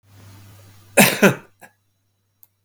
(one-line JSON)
{"cough_length": "2.6 s", "cough_amplitude": 32768, "cough_signal_mean_std_ratio": 0.28, "survey_phase": "beta (2021-08-13 to 2022-03-07)", "age": "65+", "gender": "Male", "wearing_mask": "No", "symptom_cough_any": true, "symptom_headache": true, "symptom_onset": "12 days", "smoker_status": "Ex-smoker", "respiratory_condition_asthma": false, "respiratory_condition_other": true, "recruitment_source": "REACT", "submission_delay": "1 day", "covid_test_result": "Negative", "covid_test_method": "RT-qPCR", "influenza_a_test_result": "Negative", "influenza_b_test_result": "Negative"}